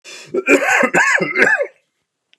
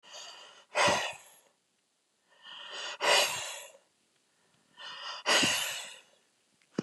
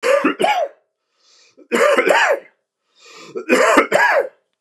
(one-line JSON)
{"cough_length": "2.4 s", "cough_amplitude": 29204, "cough_signal_mean_std_ratio": 0.63, "exhalation_length": "6.8 s", "exhalation_amplitude": 9061, "exhalation_signal_mean_std_ratio": 0.42, "three_cough_length": "4.6 s", "three_cough_amplitude": 29204, "three_cough_signal_mean_std_ratio": 0.59, "survey_phase": "beta (2021-08-13 to 2022-03-07)", "age": "45-64", "gender": "Male", "wearing_mask": "No", "symptom_sore_throat": true, "smoker_status": "Never smoked", "respiratory_condition_asthma": false, "respiratory_condition_other": false, "recruitment_source": "REACT", "submission_delay": "0 days", "covid_test_result": "Negative", "covid_test_method": "RT-qPCR", "influenza_a_test_result": "Negative", "influenza_b_test_result": "Negative"}